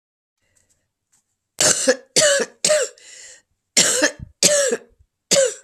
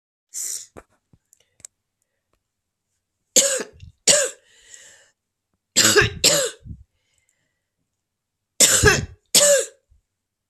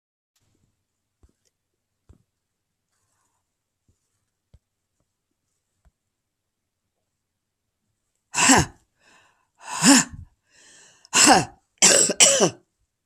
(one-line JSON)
{"cough_length": "5.6 s", "cough_amplitude": 32767, "cough_signal_mean_std_ratio": 0.47, "three_cough_length": "10.5 s", "three_cough_amplitude": 32768, "three_cough_signal_mean_std_ratio": 0.34, "exhalation_length": "13.1 s", "exhalation_amplitude": 32768, "exhalation_signal_mean_std_ratio": 0.26, "survey_phase": "beta (2021-08-13 to 2022-03-07)", "age": "65+", "gender": "Female", "wearing_mask": "No", "symptom_cough_any": true, "symptom_runny_or_blocked_nose": true, "symptom_sore_throat": true, "symptom_fatigue": true, "symptom_onset": "7 days", "smoker_status": "Never smoked", "respiratory_condition_asthma": false, "respiratory_condition_other": false, "recruitment_source": "Test and Trace", "submission_delay": "2 days", "covid_test_result": "Positive", "covid_test_method": "RT-qPCR", "covid_ct_value": 23.1, "covid_ct_gene": "ORF1ab gene"}